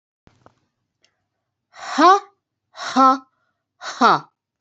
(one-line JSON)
{"exhalation_length": "4.6 s", "exhalation_amplitude": 28278, "exhalation_signal_mean_std_ratio": 0.31, "survey_phase": "beta (2021-08-13 to 2022-03-07)", "age": "45-64", "gender": "Female", "wearing_mask": "No", "symptom_none": true, "smoker_status": "Never smoked", "respiratory_condition_asthma": false, "respiratory_condition_other": false, "recruitment_source": "REACT", "submission_delay": "4 days", "covid_test_result": "Negative", "covid_test_method": "RT-qPCR", "influenza_a_test_result": "Negative", "influenza_b_test_result": "Negative"}